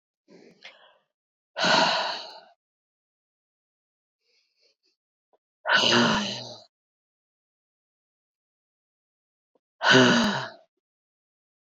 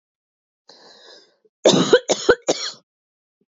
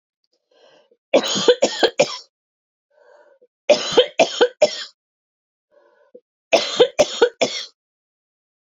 {
  "exhalation_length": "11.6 s",
  "exhalation_amplitude": 20539,
  "exhalation_signal_mean_std_ratio": 0.32,
  "cough_length": "3.5 s",
  "cough_amplitude": 28258,
  "cough_signal_mean_std_ratio": 0.32,
  "three_cough_length": "8.6 s",
  "three_cough_amplitude": 27347,
  "three_cough_signal_mean_std_ratio": 0.35,
  "survey_phase": "beta (2021-08-13 to 2022-03-07)",
  "age": "45-64",
  "gender": "Female",
  "wearing_mask": "No",
  "symptom_shortness_of_breath": true,
  "symptom_sore_throat": true,
  "symptom_fatigue": true,
  "symptom_headache": true,
  "symptom_onset": "11 days",
  "smoker_status": "Ex-smoker",
  "respiratory_condition_asthma": false,
  "respiratory_condition_other": false,
  "recruitment_source": "REACT",
  "submission_delay": "1 day",
  "covid_test_result": "Negative",
  "covid_test_method": "RT-qPCR"
}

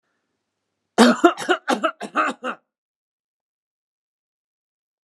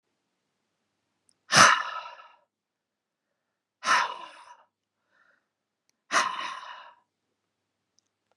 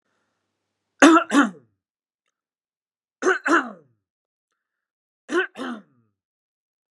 {
  "cough_length": "5.0 s",
  "cough_amplitude": 32148,
  "cough_signal_mean_std_ratio": 0.29,
  "exhalation_length": "8.4 s",
  "exhalation_amplitude": 26633,
  "exhalation_signal_mean_std_ratio": 0.25,
  "three_cough_length": "6.9 s",
  "three_cough_amplitude": 32767,
  "three_cough_signal_mean_std_ratio": 0.28,
  "survey_phase": "beta (2021-08-13 to 2022-03-07)",
  "age": "45-64",
  "gender": "Male",
  "wearing_mask": "No",
  "symptom_none": true,
  "smoker_status": "Never smoked",
  "respiratory_condition_asthma": false,
  "respiratory_condition_other": false,
  "recruitment_source": "REACT",
  "submission_delay": "5 days",
  "covid_test_result": "Negative",
  "covid_test_method": "RT-qPCR"
}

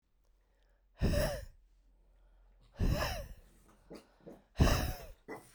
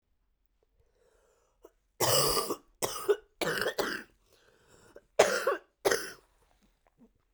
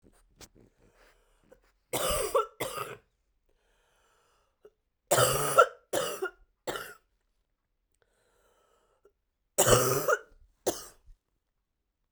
{
  "exhalation_length": "5.5 s",
  "exhalation_amplitude": 6657,
  "exhalation_signal_mean_std_ratio": 0.41,
  "cough_length": "7.3 s",
  "cough_amplitude": 14414,
  "cough_signal_mean_std_ratio": 0.38,
  "three_cough_length": "12.1 s",
  "three_cough_amplitude": 15477,
  "three_cough_signal_mean_std_ratio": 0.32,
  "survey_phase": "beta (2021-08-13 to 2022-03-07)",
  "age": "18-44",
  "gender": "Female",
  "wearing_mask": "No",
  "symptom_cough_any": true,
  "symptom_new_continuous_cough": true,
  "symptom_runny_or_blocked_nose": true,
  "symptom_shortness_of_breath": true,
  "symptom_sore_throat": true,
  "symptom_abdominal_pain": true,
  "symptom_fatigue": true,
  "symptom_fever_high_temperature": true,
  "symptom_headache": true,
  "symptom_change_to_sense_of_smell_or_taste": true,
  "symptom_loss_of_taste": true,
  "symptom_onset": "4 days",
  "smoker_status": "Never smoked",
  "respiratory_condition_asthma": false,
  "respiratory_condition_other": false,
  "recruitment_source": "Test and Trace",
  "submission_delay": "1 day",
  "covid_test_result": "Positive",
  "covid_test_method": "RT-qPCR"
}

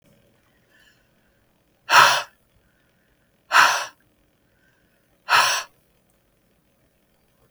{
  "exhalation_length": "7.5 s",
  "exhalation_amplitude": 32705,
  "exhalation_signal_mean_std_ratio": 0.27,
  "survey_phase": "beta (2021-08-13 to 2022-03-07)",
  "age": "18-44",
  "gender": "Female",
  "wearing_mask": "No",
  "symptom_cough_any": true,
  "symptom_runny_or_blocked_nose": true,
  "symptom_onset": "13 days",
  "smoker_status": "Ex-smoker",
  "respiratory_condition_asthma": false,
  "respiratory_condition_other": false,
  "recruitment_source": "REACT",
  "submission_delay": "2 days",
  "covid_test_result": "Negative",
  "covid_test_method": "RT-qPCR",
  "influenza_a_test_result": "Negative",
  "influenza_b_test_result": "Negative"
}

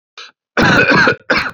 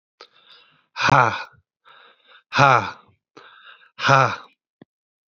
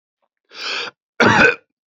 {
  "three_cough_length": "1.5 s",
  "three_cough_amplitude": 31769,
  "three_cough_signal_mean_std_ratio": 0.66,
  "exhalation_length": "5.4 s",
  "exhalation_amplitude": 27879,
  "exhalation_signal_mean_std_ratio": 0.33,
  "cough_length": "1.9 s",
  "cough_amplitude": 28849,
  "cough_signal_mean_std_ratio": 0.42,
  "survey_phase": "beta (2021-08-13 to 2022-03-07)",
  "age": "18-44",
  "gender": "Male",
  "wearing_mask": "No",
  "symptom_cough_any": true,
  "symptom_new_continuous_cough": true,
  "symptom_runny_or_blocked_nose": true,
  "symptom_sore_throat": true,
  "smoker_status": "Never smoked",
  "respiratory_condition_asthma": false,
  "respiratory_condition_other": false,
  "recruitment_source": "Test and Trace",
  "submission_delay": "2 days",
  "covid_test_result": "Positive",
  "covid_test_method": "ePCR"
}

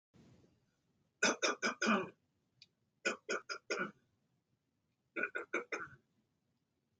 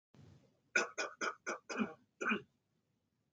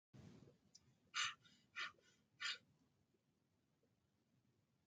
{
  "three_cough_length": "7.0 s",
  "three_cough_amplitude": 3574,
  "three_cough_signal_mean_std_ratio": 0.36,
  "cough_length": "3.3 s",
  "cough_amplitude": 3721,
  "cough_signal_mean_std_ratio": 0.4,
  "exhalation_length": "4.9 s",
  "exhalation_amplitude": 1097,
  "exhalation_signal_mean_std_ratio": 0.3,
  "survey_phase": "alpha (2021-03-01 to 2021-08-12)",
  "age": "45-64",
  "gender": "Male",
  "wearing_mask": "No",
  "symptom_none": true,
  "smoker_status": "Never smoked",
  "respiratory_condition_asthma": true,
  "respiratory_condition_other": false,
  "recruitment_source": "REACT",
  "submission_delay": "1 day",
  "covid_test_result": "Negative",
  "covid_test_method": "RT-qPCR"
}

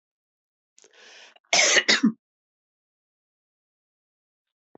{
  "cough_length": "4.8 s",
  "cough_amplitude": 20860,
  "cough_signal_mean_std_ratio": 0.26,
  "survey_phase": "beta (2021-08-13 to 2022-03-07)",
  "age": "45-64",
  "gender": "Female",
  "wearing_mask": "No",
  "symptom_none": true,
  "smoker_status": "Never smoked",
  "respiratory_condition_asthma": true,
  "respiratory_condition_other": true,
  "recruitment_source": "REACT",
  "submission_delay": "1 day",
  "covid_test_result": "Negative",
  "covid_test_method": "RT-qPCR",
  "influenza_a_test_result": "Negative",
  "influenza_b_test_result": "Negative"
}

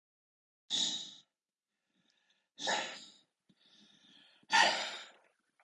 {
  "exhalation_length": "5.6 s",
  "exhalation_amplitude": 7293,
  "exhalation_signal_mean_std_ratio": 0.32,
  "survey_phase": "beta (2021-08-13 to 2022-03-07)",
  "age": "45-64",
  "gender": "Male",
  "wearing_mask": "No",
  "symptom_runny_or_blocked_nose": true,
  "smoker_status": "Never smoked",
  "respiratory_condition_asthma": false,
  "respiratory_condition_other": false,
  "recruitment_source": "REACT",
  "submission_delay": "1 day",
  "covid_test_result": "Negative",
  "covid_test_method": "RT-qPCR",
  "influenza_a_test_result": "Negative",
  "influenza_b_test_result": "Negative"
}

